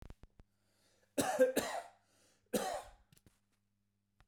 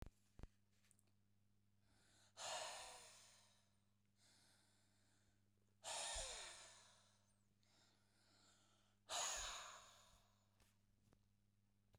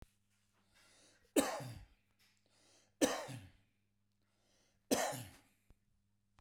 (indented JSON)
{
  "cough_length": "4.3 s",
  "cough_amplitude": 4286,
  "cough_signal_mean_std_ratio": 0.34,
  "exhalation_length": "12.0 s",
  "exhalation_amplitude": 690,
  "exhalation_signal_mean_std_ratio": 0.42,
  "three_cough_length": "6.4 s",
  "three_cough_amplitude": 4255,
  "three_cough_signal_mean_std_ratio": 0.29,
  "survey_phase": "beta (2021-08-13 to 2022-03-07)",
  "age": "45-64",
  "gender": "Male",
  "wearing_mask": "No",
  "symptom_none": true,
  "smoker_status": "Never smoked",
  "respiratory_condition_asthma": false,
  "respiratory_condition_other": false,
  "recruitment_source": "REACT",
  "submission_delay": "1 day",
  "covid_test_result": "Negative",
  "covid_test_method": "RT-qPCR",
  "influenza_a_test_result": "Negative",
  "influenza_b_test_result": "Negative"
}